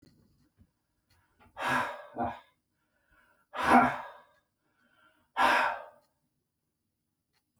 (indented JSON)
{
  "exhalation_length": "7.6 s",
  "exhalation_amplitude": 11381,
  "exhalation_signal_mean_std_ratio": 0.32,
  "survey_phase": "beta (2021-08-13 to 2022-03-07)",
  "age": "45-64",
  "gender": "Male",
  "wearing_mask": "No",
  "symptom_none": true,
  "smoker_status": "Ex-smoker",
  "respiratory_condition_asthma": false,
  "respiratory_condition_other": false,
  "recruitment_source": "REACT",
  "submission_delay": "3 days",
  "covid_test_result": "Negative",
  "covid_test_method": "RT-qPCR"
}